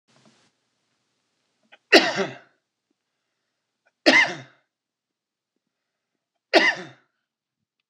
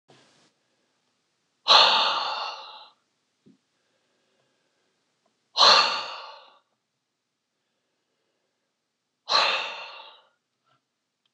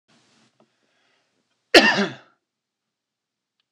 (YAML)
three_cough_length: 7.9 s
three_cough_amplitude: 26028
three_cough_signal_mean_std_ratio: 0.23
exhalation_length: 11.3 s
exhalation_amplitude: 24955
exhalation_signal_mean_std_ratio: 0.29
cough_length: 3.7 s
cough_amplitude: 26028
cough_signal_mean_std_ratio: 0.21
survey_phase: beta (2021-08-13 to 2022-03-07)
age: 45-64
gender: Male
wearing_mask: 'No'
symptom_none: true
smoker_status: Ex-smoker
respiratory_condition_asthma: true
respiratory_condition_other: false
recruitment_source: REACT
submission_delay: 12 days
covid_test_result: Negative
covid_test_method: RT-qPCR